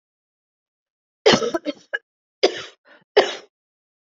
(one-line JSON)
{"three_cough_length": "4.1 s", "three_cough_amplitude": 27696, "three_cough_signal_mean_std_ratio": 0.28, "survey_phase": "beta (2021-08-13 to 2022-03-07)", "age": "45-64", "gender": "Female", "wearing_mask": "No", "symptom_none": true, "smoker_status": "Never smoked", "respiratory_condition_asthma": false, "respiratory_condition_other": false, "recruitment_source": "REACT", "submission_delay": "1 day", "covid_test_result": "Negative", "covid_test_method": "RT-qPCR", "influenza_a_test_result": "Negative", "influenza_b_test_result": "Negative"}